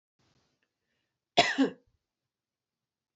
{"cough_length": "3.2 s", "cough_amplitude": 17467, "cough_signal_mean_std_ratio": 0.22, "survey_phase": "beta (2021-08-13 to 2022-03-07)", "age": "18-44", "gender": "Female", "wearing_mask": "No", "symptom_runny_or_blocked_nose": true, "symptom_headache": true, "smoker_status": "Never smoked", "respiratory_condition_asthma": false, "respiratory_condition_other": false, "recruitment_source": "Test and Trace", "submission_delay": "0 days", "covid_test_result": "Negative", "covid_test_method": "RT-qPCR"}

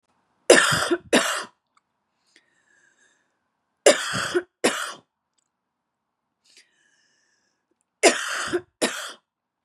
{"three_cough_length": "9.6 s", "three_cough_amplitude": 32732, "three_cough_signal_mean_std_ratio": 0.31, "survey_phase": "beta (2021-08-13 to 2022-03-07)", "age": "18-44", "gender": "Female", "wearing_mask": "No", "symptom_fatigue": true, "symptom_headache": true, "symptom_onset": "4 days", "smoker_status": "Never smoked", "respiratory_condition_asthma": false, "respiratory_condition_other": false, "recruitment_source": "Test and Trace", "submission_delay": "2 days", "covid_test_result": "Positive", "covid_test_method": "RT-qPCR", "covid_ct_value": 18.1, "covid_ct_gene": "ORF1ab gene", "covid_ct_mean": 18.5, "covid_viral_load": "830000 copies/ml", "covid_viral_load_category": "Low viral load (10K-1M copies/ml)"}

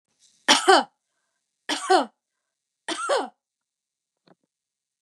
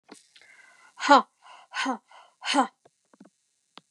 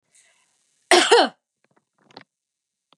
{"three_cough_length": "5.0 s", "three_cough_amplitude": 28873, "three_cough_signal_mean_std_ratio": 0.29, "exhalation_length": "3.9 s", "exhalation_amplitude": 25107, "exhalation_signal_mean_std_ratio": 0.27, "cough_length": "3.0 s", "cough_amplitude": 27294, "cough_signal_mean_std_ratio": 0.27, "survey_phase": "beta (2021-08-13 to 2022-03-07)", "age": "45-64", "gender": "Female", "wearing_mask": "No", "symptom_none": true, "smoker_status": "Ex-smoker", "respiratory_condition_asthma": false, "respiratory_condition_other": false, "recruitment_source": "REACT", "submission_delay": "3 days", "covid_test_result": "Negative", "covid_test_method": "RT-qPCR", "influenza_a_test_result": "Negative", "influenza_b_test_result": "Negative"}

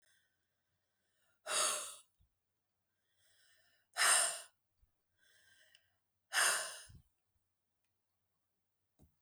{"exhalation_length": "9.2 s", "exhalation_amplitude": 4556, "exhalation_signal_mean_std_ratio": 0.28, "survey_phase": "beta (2021-08-13 to 2022-03-07)", "age": "45-64", "gender": "Female", "wearing_mask": "No", "symptom_none": true, "symptom_onset": "7 days", "smoker_status": "Never smoked", "respiratory_condition_asthma": false, "respiratory_condition_other": false, "recruitment_source": "REACT", "submission_delay": "1 day", "covid_test_result": "Negative", "covid_test_method": "RT-qPCR", "influenza_a_test_result": "Negative", "influenza_b_test_result": "Negative"}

